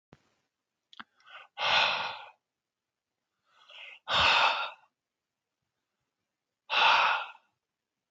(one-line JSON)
{"exhalation_length": "8.1 s", "exhalation_amplitude": 9225, "exhalation_signal_mean_std_ratio": 0.37, "survey_phase": "beta (2021-08-13 to 2022-03-07)", "age": "65+", "gender": "Male", "wearing_mask": "No", "symptom_none": true, "smoker_status": "Never smoked", "respiratory_condition_asthma": false, "respiratory_condition_other": false, "recruitment_source": "REACT", "submission_delay": "2 days", "covid_test_result": "Negative", "covid_test_method": "RT-qPCR", "influenza_a_test_result": "Negative", "influenza_b_test_result": "Negative"}